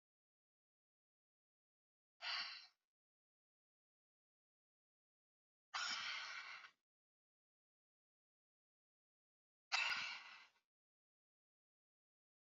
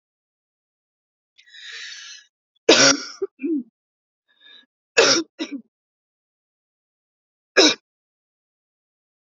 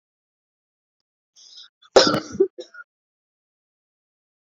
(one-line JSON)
{"exhalation_length": "12.5 s", "exhalation_amplitude": 1532, "exhalation_signal_mean_std_ratio": 0.28, "three_cough_length": "9.2 s", "three_cough_amplitude": 31052, "three_cough_signal_mean_std_ratio": 0.26, "cough_length": "4.4 s", "cough_amplitude": 28443, "cough_signal_mean_std_ratio": 0.21, "survey_phase": "beta (2021-08-13 to 2022-03-07)", "age": "18-44", "gender": "Female", "wearing_mask": "No", "symptom_cough_any": true, "symptom_sore_throat": true, "symptom_fever_high_temperature": true, "symptom_headache": true, "symptom_other": true, "smoker_status": "Ex-smoker", "respiratory_condition_asthma": false, "respiratory_condition_other": false, "recruitment_source": "Test and Trace", "submission_delay": "1 day", "covid_test_result": "Positive", "covid_test_method": "RT-qPCR", "covid_ct_value": 15.6, "covid_ct_gene": "ORF1ab gene", "covid_ct_mean": 16.0, "covid_viral_load": "5900000 copies/ml", "covid_viral_load_category": "High viral load (>1M copies/ml)"}